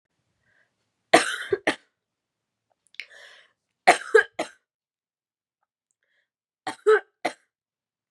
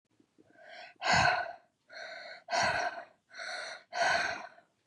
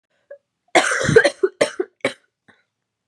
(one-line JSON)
{"three_cough_length": "8.1 s", "three_cough_amplitude": 30866, "three_cough_signal_mean_std_ratio": 0.22, "exhalation_length": "4.9 s", "exhalation_amplitude": 7636, "exhalation_signal_mean_std_ratio": 0.52, "cough_length": "3.1 s", "cough_amplitude": 32561, "cough_signal_mean_std_ratio": 0.36, "survey_phase": "beta (2021-08-13 to 2022-03-07)", "age": "18-44", "gender": "Female", "wearing_mask": "No", "symptom_new_continuous_cough": true, "symptom_runny_or_blocked_nose": true, "symptom_sore_throat": true, "symptom_fatigue": true, "symptom_headache": true, "symptom_onset": "2 days", "smoker_status": "Never smoked", "respiratory_condition_asthma": false, "respiratory_condition_other": false, "recruitment_source": "Test and Trace", "submission_delay": "1 day", "covid_test_result": "Positive", "covid_test_method": "RT-qPCR", "covid_ct_value": 26.9, "covid_ct_gene": "ORF1ab gene", "covid_ct_mean": 27.3, "covid_viral_load": "1100 copies/ml", "covid_viral_load_category": "Minimal viral load (< 10K copies/ml)"}